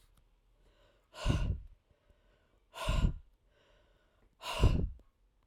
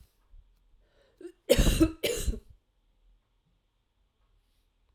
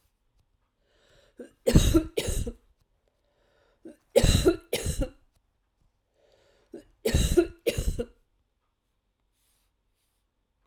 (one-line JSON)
{"exhalation_length": "5.5 s", "exhalation_amplitude": 5860, "exhalation_signal_mean_std_ratio": 0.37, "cough_length": "4.9 s", "cough_amplitude": 14041, "cough_signal_mean_std_ratio": 0.29, "three_cough_length": "10.7 s", "three_cough_amplitude": 22942, "three_cough_signal_mean_std_ratio": 0.32, "survey_phase": "alpha (2021-03-01 to 2021-08-12)", "age": "45-64", "gender": "Female", "wearing_mask": "No", "symptom_cough_any": true, "symptom_fatigue": true, "symptom_headache": true, "smoker_status": "Never smoked", "respiratory_condition_asthma": false, "respiratory_condition_other": false, "recruitment_source": "Test and Trace", "submission_delay": "2 days", "covid_test_result": "Positive", "covid_test_method": "RT-qPCR"}